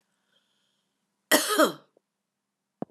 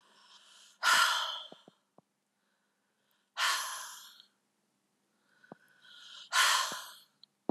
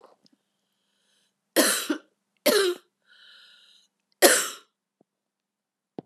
{"cough_length": "2.9 s", "cough_amplitude": 19471, "cough_signal_mean_std_ratio": 0.26, "exhalation_length": "7.5 s", "exhalation_amplitude": 7610, "exhalation_signal_mean_std_ratio": 0.36, "three_cough_length": "6.1 s", "three_cough_amplitude": 28202, "three_cough_signal_mean_std_ratio": 0.3, "survey_phase": "beta (2021-08-13 to 2022-03-07)", "age": "45-64", "gender": "Female", "wearing_mask": "No", "symptom_runny_or_blocked_nose": true, "symptom_abdominal_pain": true, "symptom_headache": true, "symptom_loss_of_taste": true, "symptom_onset": "3 days", "smoker_status": "Never smoked", "respiratory_condition_asthma": false, "respiratory_condition_other": false, "recruitment_source": "Test and Trace", "submission_delay": "2 days", "covid_test_result": "Positive", "covid_test_method": "RT-qPCR", "covid_ct_value": 20.2, "covid_ct_gene": "ORF1ab gene", "covid_ct_mean": 20.9, "covid_viral_load": "140000 copies/ml", "covid_viral_load_category": "Low viral load (10K-1M copies/ml)"}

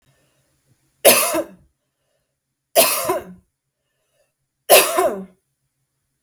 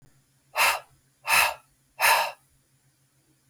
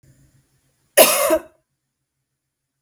{"three_cough_length": "6.2 s", "three_cough_amplitude": 32768, "three_cough_signal_mean_std_ratio": 0.33, "exhalation_length": "3.5 s", "exhalation_amplitude": 15140, "exhalation_signal_mean_std_ratio": 0.38, "cough_length": "2.8 s", "cough_amplitude": 32768, "cough_signal_mean_std_ratio": 0.29, "survey_phase": "beta (2021-08-13 to 2022-03-07)", "age": "18-44", "gender": "Female", "wearing_mask": "No", "symptom_cough_any": true, "symptom_runny_or_blocked_nose": true, "symptom_fatigue": true, "symptom_headache": true, "symptom_onset": "12 days", "smoker_status": "Never smoked", "respiratory_condition_asthma": false, "respiratory_condition_other": false, "recruitment_source": "REACT", "submission_delay": "2 days", "covid_test_result": "Negative", "covid_test_method": "RT-qPCR", "influenza_a_test_result": "Negative", "influenza_b_test_result": "Negative"}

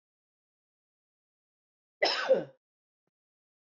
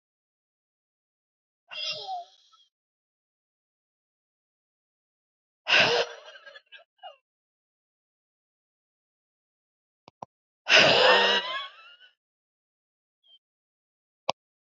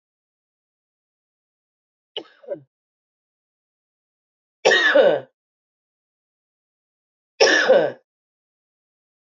{"cough_length": "3.7 s", "cough_amplitude": 6765, "cough_signal_mean_std_ratio": 0.24, "exhalation_length": "14.8 s", "exhalation_amplitude": 22679, "exhalation_signal_mean_std_ratio": 0.25, "three_cough_length": "9.4 s", "three_cough_amplitude": 25675, "three_cough_signal_mean_std_ratio": 0.27, "survey_phase": "beta (2021-08-13 to 2022-03-07)", "age": "45-64", "gender": "Female", "wearing_mask": "No", "symptom_cough_any": true, "symptom_runny_or_blocked_nose": true, "symptom_sore_throat": true, "symptom_fatigue": true, "symptom_headache": true, "smoker_status": "Never smoked", "respiratory_condition_asthma": false, "respiratory_condition_other": false, "recruitment_source": "Test and Trace", "submission_delay": "2 days", "covid_test_result": "Positive", "covid_test_method": "LFT"}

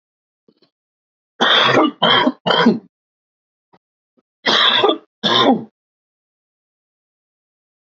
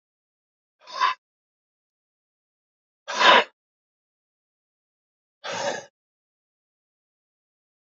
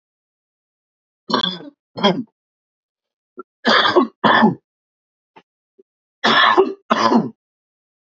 {"cough_length": "7.9 s", "cough_amplitude": 30506, "cough_signal_mean_std_ratio": 0.42, "exhalation_length": "7.9 s", "exhalation_amplitude": 27090, "exhalation_signal_mean_std_ratio": 0.21, "three_cough_length": "8.2 s", "three_cough_amplitude": 28744, "three_cough_signal_mean_std_ratio": 0.39, "survey_phase": "beta (2021-08-13 to 2022-03-07)", "age": "45-64", "gender": "Male", "wearing_mask": "No", "symptom_cough_any": true, "symptom_sore_throat": true, "symptom_onset": "10 days", "smoker_status": "Never smoked", "respiratory_condition_asthma": true, "respiratory_condition_other": false, "recruitment_source": "Test and Trace", "submission_delay": "2 days", "covid_test_result": "Positive", "covid_test_method": "ePCR"}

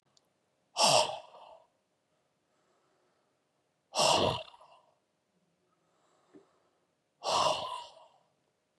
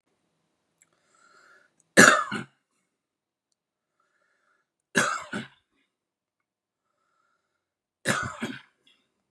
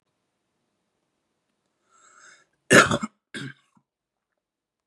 {"exhalation_length": "8.8 s", "exhalation_amplitude": 8735, "exhalation_signal_mean_std_ratio": 0.31, "three_cough_length": "9.3 s", "three_cough_amplitude": 31887, "three_cough_signal_mean_std_ratio": 0.21, "cough_length": "4.9 s", "cough_amplitude": 32657, "cough_signal_mean_std_ratio": 0.18, "survey_phase": "beta (2021-08-13 to 2022-03-07)", "age": "45-64", "gender": "Male", "wearing_mask": "No", "symptom_runny_or_blocked_nose": true, "symptom_onset": "2 days", "smoker_status": "Current smoker (11 or more cigarettes per day)", "respiratory_condition_asthma": false, "respiratory_condition_other": false, "recruitment_source": "Test and Trace", "submission_delay": "2 days", "covid_test_result": "Positive", "covid_test_method": "RT-qPCR", "covid_ct_value": 15.5, "covid_ct_gene": "ORF1ab gene"}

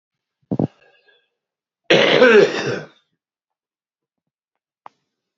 {"cough_length": "5.4 s", "cough_amplitude": 29278, "cough_signal_mean_std_ratio": 0.32, "survey_phase": "beta (2021-08-13 to 2022-03-07)", "age": "45-64", "gender": "Male", "wearing_mask": "No", "symptom_cough_any": true, "symptom_fatigue": true, "smoker_status": "Current smoker (11 or more cigarettes per day)", "respiratory_condition_asthma": false, "respiratory_condition_other": true, "recruitment_source": "Test and Trace", "submission_delay": "1 day", "covid_test_result": "Positive", "covid_test_method": "RT-qPCR"}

